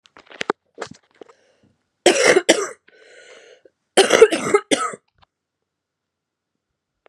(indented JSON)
{
  "three_cough_length": "7.1 s",
  "three_cough_amplitude": 32768,
  "three_cough_signal_mean_std_ratio": 0.3,
  "survey_phase": "beta (2021-08-13 to 2022-03-07)",
  "age": "18-44",
  "gender": "Female",
  "wearing_mask": "No",
  "symptom_cough_any": true,
  "symptom_new_continuous_cough": true,
  "symptom_runny_or_blocked_nose": true,
  "symptom_shortness_of_breath": true,
  "symptom_sore_throat": true,
  "symptom_headache": true,
  "symptom_other": true,
  "symptom_onset": "2 days",
  "smoker_status": "Current smoker (e-cigarettes or vapes only)",
  "respiratory_condition_asthma": false,
  "respiratory_condition_other": false,
  "recruitment_source": "Test and Trace",
  "submission_delay": "2 days",
  "covid_test_result": "Positive",
  "covid_test_method": "RT-qPCR",
  "covid_ct_value": 16.6,
  "covid_ct_gene": "ORF1ab gene",
  "covid_ct_mean": 17.0,
  "covid_viral_load": "2600000 copies/ml",
  "covid_viral_load_category": "High viral load (>1M copies/ml)"
}